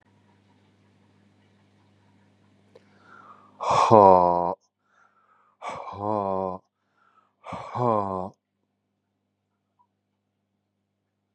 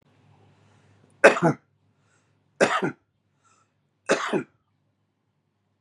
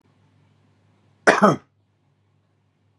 {
  "exhalation_length": "11.3 s",
  "exhalation_amplitude": 29101,
  "exhalation_signal_mean_std_ratio": 0.26,
  "three_cough_length": "5.8 s",
  "three_cough_amplitude": 30095,
  "three_cough_signal_mean_std_ratio": 0.25,
  "cough_length": "3.0 s",
  "cough_amplitude": 32767,
  "cough_signal_mean_std_ratio": 0.23,
  "survey_phase": "beta (2021-08-13 to 2022-03-07)",
  "age": "45-64",
  "gender": "Male",
  "wearing_mask": "No",
  "symptom_none": true,
  "symptom_onset": "12 days",
  "smoker_status": "Current smoker (11 or more cigarettes per day)",
  "respiratory_condition_asthma": false,
  "respiratory_condition_other": false,
  "recruitment_source": "REACT",
  "submission_delay": "3 days",
  "covid_test_result": "Negative",
  "covid_test_method": "RT-qPCR"
}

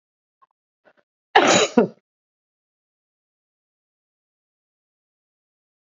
{
  "cough_length": "5.8 s",
  "cough_amplitude": 27161,
  "cough_signal_mean_std_ratio": 0.2,
  "survey_phase": "beta (2021-08-13 to 2022-03-07)",
  "age": "65+",
  "gender": "Female",
  "wearing_mask": "No",
  "symptom_none": true,
  "smoker_status": "Current smoker (1 to 10 cigarettes per day)",
  "respiratory_condition_asthma": false,
  "respiratory_condition_other": false,
  "recruitment_source": "REACT",
  "submission_delay": "2 days",
  "covid_test_result": "Negative",
  "covid_test_method": "RT-qPCR",
  "influenza_a_test_result": "Negative",
  "influenza_b_test_result": "Negative"
}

